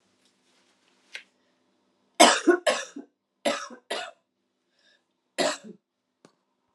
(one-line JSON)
{"cough_length": "6.7 s", "cough_amplitude": 29211, "cough_signal_mean_std_ratio": 0.26, "survey_phase": "beta (2021-08-13 to 2022-03-07)", "age": "45-64", "gender": "Female", "wearing_mask": "No", "symptom_cough_any": true, "symptom_runny_or_blocked_nose": true, "symptom_abdominal_pain": true, "symptom_fatigue": true, "symptom_headache": true, "symptom_other": true, "smoker_status": "Never smoked", "respiratory_condition_asthma": false, "respiratory_condition_other": false, "recruitment_source": "Test and Trace", "submission_delay": "2 days", "covid_test_result": "Positive", "covid_test_method": "RT-qPCR", "covid_ct_value": 29.3, "covid_ct_gene": "ORF1ab gene", "covid_ct_mean": 29.9, "covid_viral_load": "160 copies/ml", "covid_viral_load_category": "Minimal viral load (< 10K copies/ml)"}